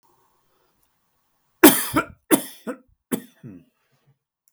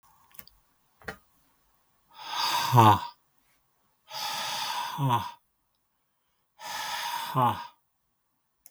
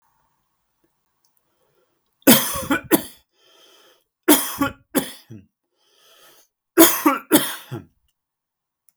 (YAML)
cough_length: 4.5 s
cough_amplitude: 32768
cough_signal_mean_std_ratio: 0.23
exhalation_length: 8.7 s
exhalation_amplitude: 20653
exhalation_signal_mean_std_ratio: 0.38
three_cough_length: 9.0 s
three_cough_amplitude: 32768
three_cough_signal_mean_std_ratio: 0.29
survey_phase: beta (2021-08-13 to 2022-03-07)
age: 45-64
gender: Male
wearing_mask: 'No'
symptom_none: true
smoker_status: Never smoked
respiratory_condition_asthma: false
respiratory_condition_other: false
recruitment_source: REACT
submission_delay: 2 days
covid_test_result: Negative
covid_test_method: RT-qPCR
influenza_a_test_result: Negative
influenza_b_test_result: Negative